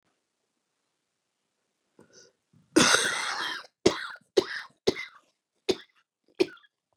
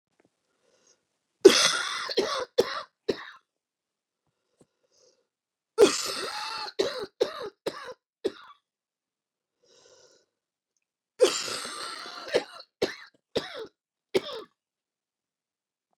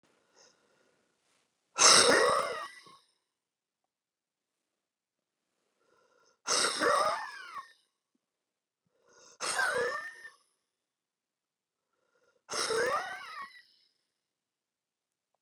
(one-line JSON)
{"cough_length": "7.0 s", "cough_amplitude": 17246, "cough_signal_mean_std_ratio": 0.29, "three_cough_length": "16.0 s", "three_cough_amplitude": 28845, "three_cough_signal_mean_std_ratio": 0.29, "exhalation_length": "15.4 s", "exhalation_amplitude": 12505, "exhalation_signal_mean_std_ratio": 0.31, "survey_phase": "beta (2021-08-13 to 2022-03-07)", "age": "65+", "gender": "Female", "wearing_mask": "No", "symptom_cough_any": true, "symptom_sore_throat": true, "symptom_diarrhoea": true, "symptom_headache": true, "symptom_onset": "2 days", "smoker_status": "Ex-smoker", "respiratory_condition_asthma": false, "respiratory_condition_other": false, "recruitment_source": "REACT", "submission_delay": "1 day", "covid_test_result": "Negative", "covid_test_method": "RT-qPCR", "influenza_a_test_result": "Negative", "influenza_b_test_result": "Negative"}